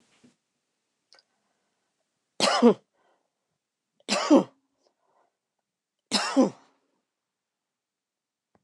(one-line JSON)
{"three_cough_length": "8.6 s", "three_cough_amplitude": 16984, "three_cough_signal_mean_std_ratio": 0.23, "survey_phase": "beta (2021-08-13 to 2022-03-07)", "age": "45-64", "gender": "Female", "wearing_mask": "No", "symptom_cough_any": true, "symptom_new_continuous_cough": true, "symptom_runny_or_blocked_nose": true, "symptom_sore_throat": true, "symptom_fatigue": true, "symptom_headache": true, "smoker_status": "Never smoked", "respiratory_condition_asthma": false, "respiratory_condition_other": false, "recruitment_source": "Test and Trace", "submission_delay": "0 days", "covid_test_result": "Positive", "covid_test_method": "LFT"}